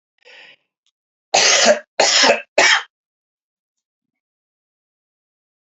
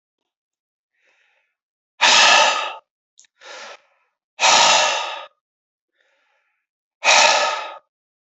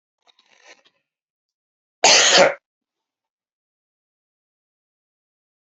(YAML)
three_cough_length: 5.6 s
three_cough_amplitude: 31013
three_cough_signal_mean_std_ratio: 0.36
exhalation_length: 8.4 s
exhalation_amplitude: 29247
exhalation_signal_mean_std_ratio: 0.39
cough_length: 5.7 s
cough_amplitude: 29746
cough_signal_mean_std_ratio: 0.23
survey_phase: beta (2021-08-13 to 2022-03-07)
age: 45-64
gender: Male
wearing_mask: 'No'
symptom_cough_any: true
symptom_new_continuous_cough: true
symptom_runny_or_blocked_nose: true
symptom_fatigue: true
symptom_fever_high_temperature: true
symptom_headache: true
symptom_change_to_sense_of_smell_or_taste: true
symptom_loss_of_taste: true
symptom_onset: 6 days
smoker_status: Ex-smoker
respiratory_condition_asthma: false
respiratory_condition_other: false
recruitment_source: Test and Trace
submission_delay: 2 days
covid_test_result: Positive
covid_test_method: RT-qPCR
covid_ct_value: 15.9
covid_ct_gene: ORF1ab gene
covid_ct_mean: 16.3
covid_viral_load: 4300000 copies/ml
covid_viral_load_category: High viral load (>1M copies/ml)